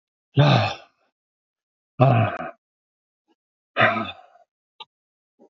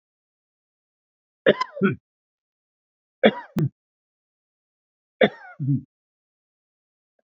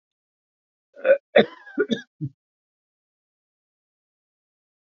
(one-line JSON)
{"exhalation_length": "5.5 s", "exhalation_amplitude": 26580, "exhalation_signal_mean_std_ratio": 0.34, "three_cough_length": "7.3 s", "three_cough_amplitude": 25975, "three_cough_signal_mean_std_ratio": 0.24, "cough_length": "4.9 s", "cough_amplitude": 23902, "cough_signal_mean_std_ratio": 0.21, "survey_phase": "beta (2021-08-13 to 2022-03-07)", "age": "65+", "gender": "Male", "wearing_mask": "No", "symptom_none": true, "smoker_status": "Never smoked", "respiratory_condition_asthma": false, "respiratory_condition_other": false, "recruitment_source": "REACT", "submission_delay": "1 day", "covid_test_result": "Negative", "covid_test_method": "RT-qPCR", "influenza_a_test_result": "Negative", "influenza_b_test_result": "Negative"}